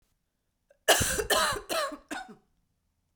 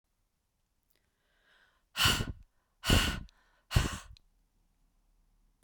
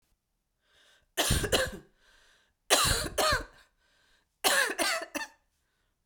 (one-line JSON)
{"cough_length": "3.2 s", "cough_amplitude": 16844, "cough_signal_mean_std_ratio": 0.43, "exhalation_length": "5.6 s", "exhalation_amplitude": 9287, "exhalation_signal_mean_std_ratio": 0.3, "three_cough_length": "6.1 s", "three_cough_amplitude": 14194, "three_cough_signal_mean_std_ratio": 0.44, "survey_phase": "beta (2021-08-13 to 2022-03-07)", "age": "45-64", "gender": "Female", "wearing_mask": "No", "symptom_cough_any": true, "symptom_runny_or_blocked_nose": true, "symptom_fatigue": true, "symptom_headache": true, "symptom_loss_of_taste": true, "symptom_other": true, "symptom_onset": "6 days", "smoker_status": "Ex-smoker", "respiratory_condition_asthma": false, "respiratory_condition_other": false, "recruitment_source": "Test and Trace", "submission_delay": "1 day", "covid_test_result": "Positive", "covid_test_method": "ePCR"}